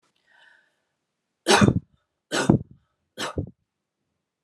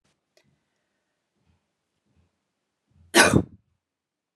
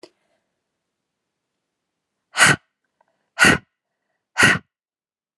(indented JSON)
{
  "three_cough_length": "4.4 s",
  "three_cough_amplitude": 26653,
  "three_cough_signal_mean_std_ratio": 0.28,
  "cough_length": "4.4 s",
  "cough_amplitude": 25875,
  "cough_signal_mean_std_ratio": 0.19,
  "exhalation_length": "5.4 s",
  "exhalation_amplitude": 31827,
  "exhalation_signal_mean_std_ratio": 0.25,
  "survey_phase": "alpha (2021-03-01 to 2021-08-12)",
  "age": "18-44",
  "gender": "Female",
  "wearing_mask": "No",
  "symptom_fatigue": true,
  "symptom_onset": "13 days",
  "smoker_status": "Ex-smoker",
  "respiratory_condition_asthma": false,
  "respiratory_condition_other": false,
  "recruitment_source": "REACT",
  "submission_delay": "0 days",
  "covid_test_result": "Negative",
  "covid_test_method": "RT-qPCR"
}